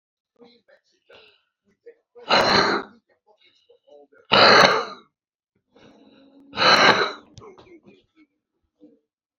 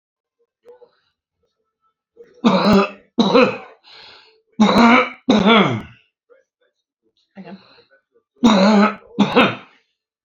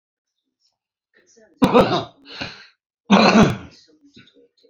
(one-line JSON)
{"exhalation_length": "9.4 s", "exhalation_amplitude": 29192, "exhalation_signal_mean_std_ratio": 0.33, "three_cough_length": "10.2 s", "three_cough_amplitude": 29332, "three_cough_signal_mean_std_ratio": 0.43, "cough_length": "4.7 s", "cough_amplitude": 30560, "cough_signal_mean_std_ratio": 0.35, "survey_phase": "beta (2021-08-13 to 2022-03-07)", "age": "65+", "gender": "Male", "wearing_mask": "No", "symptom_fatigue": true, "smoker_status": "Current smoker (11 or more cigarettes per day)", "respiratory_condition_asthma": true, "respiratory_condition_other": true, "recruitment_source": "REACT", "submission_delay": "6 days", "covid_test_result": "Negative", "covid_test_method": "RT-qPCR"}